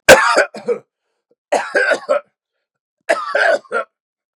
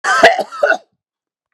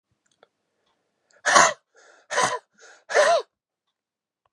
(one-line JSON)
{"three_cough_length": "4.4 s", "three_cough_amplitude": 32768, "three_cough_signal_mean_std_ratio": 0.44, "cough_length": "1.5 s", "cough_amplitude": 32768, "cough_signal_mean_std_ratio": 0.47, "exhalation_length": "4.5 s", "exhalation_amplitude": 29948, "exhalation_signal_mean_std_ratio": 0.33, "survey_phase": "beta (2021-08-13 to 2022-03-07)", "age": "45-64", "gender": "Male", "wearing_mask": "No", "symptom_cough_any": true, "symptom_runny_or_blocked_nose": true, "symptom_shortness_of_breath": true, "symptom_sore_throat": true, "smoker_status": "Never smoked", "respiratory_condition_asthma": true, "respiratory_condition_other": false, "recruitment_source": "Test and Trace", "submission_delay": "2 days", "covid_test_result": "Positive", "covid_test_method": "LFT"}